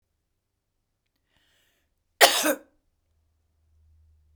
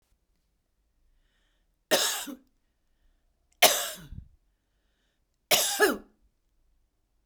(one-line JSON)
{"cough_length": "4.4 s", "cough_amplitude": 32767, "cough_signal_mean_std_ratio": 0.19, "three_cough_length": "7.3 s", "three_cough_amplitude": 21093, "three_cough_signal_mean_std_ratio": 0.28, "survey_phase": "beta (2021-08-13 to 2022-03-07)", "age": "45-64", "gender": "Female", "wearing_mask": "No", "symptom_none": true, "smoker_status": "Never smoked", "respiratory_condition_asthma": false, "respiratory_condition_other": false, "recruitment_source": "REACT", "submission_delay": "2 days", "covid_test_result": "Negative", "covid_test_method": "RT-qPCR", "influenza_a_test_result": "Unknown/Void", "influenza_b_test_result": "Unknown/Void"}